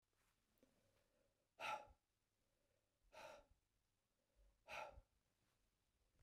{"exhalation_length": "6.2 s", "exhalation_amplitude": 466, "exhalation_signal_mean_std_ratio": 0.3, "survey_phase": "beta (2021-08-13 to 2022-03-07)", "age": "65+", "gender": "Male", "wearing_mask": "No", "symptom_none": true, "smoker_status": "Never smoked", "respiratory_condition_asthma": false, "respiratory_condition_other": false, "recruitment_source": "REACT", "submission_delay": "3 days", "covid_test_result": "Negative", "covid_test_method": "RT-qPCR", "influenza_a_test_result": "Negative", "influenza_b_test_result": "Negative"}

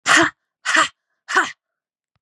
{"exhalation_length": "2.2 s", "exhalation_amplitude": 28913, "exhalation_signal_mean_std_ratio": 0.42, "survey_phase": "beta (2021-08-13 to 2022-03-07)", "age": "45-64", "gender": "Female", "wearing_mask": "No", "symptom_cough_any": true, "symptom_new_continuous_cough": true, "symptom_runny_or_blocked_nose": true, "symptom_change_to_sense_of_smell_or_taste": true, "symptom_loss_of_taste": true, "symptom_onset": "2 days", "smoker_status": "Never smoked", "respiratory_condition_asthma": true, "respiratory_condition_other": false, "recruitment_source": "Test and Trace", "submission_delay": "1 day", "covid_test_result": "Positive", "covid_test_method": "RT-qPCR", "covid_ct_value": 15.6, "covid_ct_gene": "ORF1ab gene", "covid_ct_mean": 16.0, "covid_viral_load": "5500000 copies/ml", "covid_viral_load_category": "High viral load (>1M copies/ml)"}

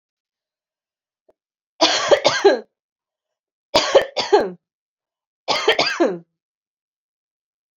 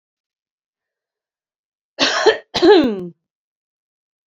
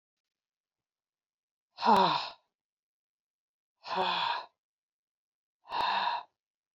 {"three_cough_length": "7.8 s", "three_cough_amplitude": 31325, "three_cough_signal_mean_std_ratio": 0.36, "cough_length": "4.3 s", "cough_amplitude": 30166, "cough_signal_mean_std_ratio": 0.33, "exhalation_length": "6.7 s", "exhalation_amplitude": 8868, "exhalation_signal_mean_std_ratio": 0.36, "survey_phase": "beta (2021-08-13 to 2022-03-07)", "age": "45-64", "gender": "Female", "wearing_mask": "No", "symptom_cough_any": true, "symptom_runny_or_blocked_nose": true, "symptom_shortness_of_breath": true, "symptom_fatigue": true, "symptom_onset": "3 days", "smoker_status": "Never smoked", "respiratory_condition_asthma": true, "respiratory_condition_other": false, "recruitment_source": "Test and Trace", "submission_delay": "1 day", "covid_test_result": "Positive", "covid_test_method": "RT-qPCR", "covid_ct_value": 27.2, "covid_ct_gene": "ORF1ab gene"}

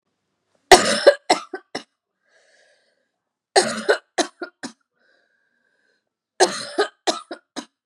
{"three_cough_length": "7.9 s", "three_cough_amplitude": 32768, "three_cough_signal_mean_std_ratio": 0.27, "survey_phase": "beta (2021-08-13 to 2022-03-07)", "age": "18-44", "gender": "Female", "wearing_mask": "No", "symptom_cough_any": true, "symptom_new_continuous_cough": true, "symptom_shortness_of_breath": true, "symptom_sore_throat": true, "symptom_fatigue": true, "symptom_fever_high_temperature": true, "symptom_headache": true, "symptom_onset": "3 days", "smoker_status": "Never smoked", "respiratory_condition_asthma": false, "respiratory_condition_other": false, "recruitment_source": "Test and Trace", "submission_delay": "2 days", "covid_test_result": "Positive", "covid_test_method": "RT-qPCR", "covid_ct_value": 22.7, "covid_ct_gene": "ORF1ab gene"}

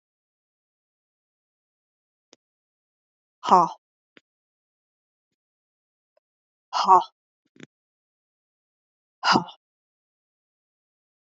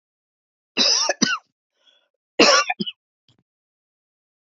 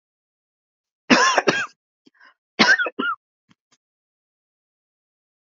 {"exhalation_length": "11.3 s", "exhalation_amplitude": 25759, "exhalation_signal_mean_std_ratio": 0.17, "cough_length": "4.5 s", "cough_amplitude": 28684, "cough_signal_mean_std_ratio": 0.33, "three_cough_length": "5.5 s", "three_cough_amplitude": 31201, "three_cough_signal_mean_std_ratio": 0.31, "survey_phase": "alpha (2021-03-01 to 2021-08-12)", "age": "45-64", "gender": "Female", "wearing_mask": "No", "symptom_none": true, "smoker_status": "Ex-smoker", "respiratory_condition_asthma": true, "respiratory_condition_other": false, "recruitment_source": "REACT", "submission_delay": "1 day", "covid_test_result": "Negative", "covid_test_method": "RT-qPCR"}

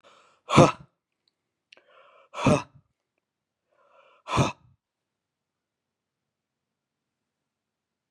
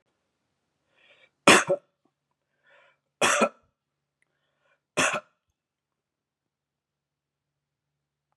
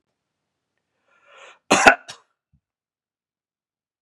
{"exhalation_length": "8.1 s", "exhalation_amplitude": 30333, "exhalation_signal_mean_std_ratio": 0.19, "three_cough_length": "8.4 s", "three_cough_amplitude": 32739, "three_cough_signal_mean_std_ratio": 0.21, "cough_length": "4.0 s", "cough_amplitude": 32768, "cough_signal_mean_std_ratio": 0.18, "survey_phase": "beta (2021-08-13 to 2022-03-07)", "age": "65+", "gender": "Male", "wearing_mask": "No", "symptom_none": true, "smoker_status": "Never smoked", "respiratory_condition_asthma": false, "respiratory_condition_other": false, "recruitment_source": "REACT", "submission_delay": "1 day", "covid_test_result": "Negative", "covid_test_method": "RT-qPCR"}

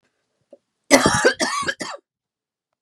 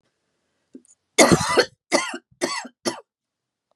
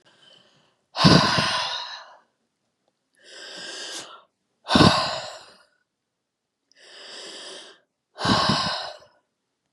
{"cough_length": "2.8 s", "cough_amplitude": 32768, "cough_signal_mean_std_ratio": 0.38, "three_cough_length": "3.8 s", "three_cough_amplitude": 32767, "three_cough_signal_mean_std_ratio": 0.34, "exhalation_length": "9.7 s", "exhalation_amplitude": 29005, "exhalation_signal_mean_std_ratio": 0.37, "survey_phase": "beta (2021-08-13 to 2022-03-07)", "age": "45-64", "gender": "Female", "wearing_mask": "No", "symptom_change_to_sense_of_smell_or_taste": true, "symptom_onset": "12 days", "smoker_status": "Ex-smoker", "respiratory_condition_asthma": false, "respiratory_condition_other": false, "recruitment_source": "REACT", "submission_delay": "2 days", "covid_test_result": "Negative", "covid_test_method": "RT-qPCR", "influenza_a_test_result": "Negative", "influenza_b_test_result": "Negative"}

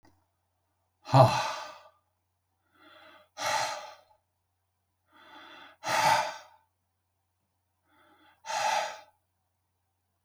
{"exhalation_length": "10.2 s", "exhalation_amplitude": 18056, "exhalation_signal_mean_std_ratio": 0.3, "survey_phase": "beta (2021-08-13 to 2022-03-07)", "age": "65+", "gender": "Male", "wearing_mask": "No", "symptom_none": true, "smoker_status": "Never smoked", "respiratory_condition_asthma": false, "respiratory_condition_other": false, "recruitment_source": "REACT", "submission_delay": "1 day", "covid_test_result": "Negative", "covid_test_method": "RT-qPCR"}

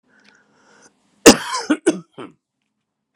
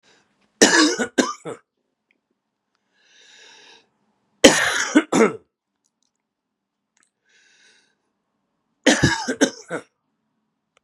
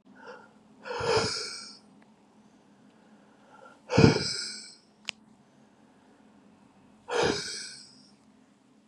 {"cough_length": "3.2 s", "cough_amplitude": 32768, "cough_signal_mean_std_ratio": 0.23, "three_cough_length": "10.8 s", "three_cough_amplitude": 32768, "three_cough_signal_mean_std_ratio": 0.3, "exhalation_length": "8.9 s", "exhalation_amplitude": 26452, "exhalation_signal_mean_std_ratio": 0.33, "survey_phase": "beta (2021-08-13 to 2022-03-07)", "age": "45-64", "gender": "Male", "wearing_mask": "No", "symptom_cough_any": true, "symptom_runny_or_blocked_nose": true, "symptom_onset": "5 days", "smoker_status": "Ex-smoker", "respiratory_condition_asthma": false, "respiratory_condition_other": false, "recruitment_source": "Test and Trace", "submission_delay": "2 days", "covid_test_result": "Positive", "covid_test_method": "RT-qPCR", "covid_ct_value": 28.1, "covid_ct_gene": "ORF1ab gene"}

